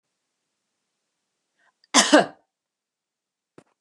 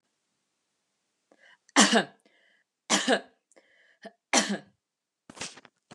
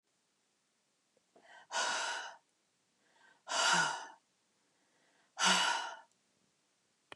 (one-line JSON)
{"cough_length": "3.8 s", "cough_amplitude": 31619, "cough_signal_mean_std_ratio": 0.2, "three_cough_length": "5.9 s", "three_cough_amplitude": 19818, "three_cough_signal_mean_std_ratio": 0.28, "exhalation_length": "7.2 s", "exhalation_amplitude": 5063, "exhalation_signal_mean_std_ratio": 0.38, "survey_phase": "beta (2021-08-13 to 2022-03-07)", "age": "45-64", "gender": "Female", "wearing_mask": "No", "symptom_none": true, "smoker_status": "Never smoked", "respiratory_condition_asthma": false, "respiratory_condition_other": false, "recruitment_source": "REACT", "submission_delay": "1 day", "covid_test_result": "Negative", "covid_test_method": "RT-qPCR", "influenza_a_test_result": "Negative", "influenza_b_test_result": "Negative"}